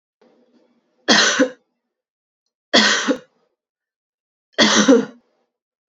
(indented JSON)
{
  "three_cough_length": "5.9 s",
  "three_cough_amplitude": 32768,
  "three_cough_signal_mean_std_ratio": 0.37,
  "survey_phase": "beta (2021-08-13 to 2022-03-07)",
  "age": "45-64",
  "gender": "Female",
  "wearing_mask": "No",
  "symptom_cough_any": true,
  "symptom_runny_or_blocked_nose": true,
  "symptom_fatigue": true,
  "symptom_other": true,
  "symptom_onset": "5 days",
  "smoker_status": "Current smoker (e-cigarettes or vapes only)",
  "respiratory_condition_asthma": true,
  "respiratory_condition_other": false,
  "recruitment_source": "Test and Trace",
  "submission_delay": "1 day",
  "covid_test_result": "Positive",
  "covid_test_method": "RT-qPCR",
  "covid_ct_value": 21.1,
  "covid_ct_gene": "ORF1ab gene"
}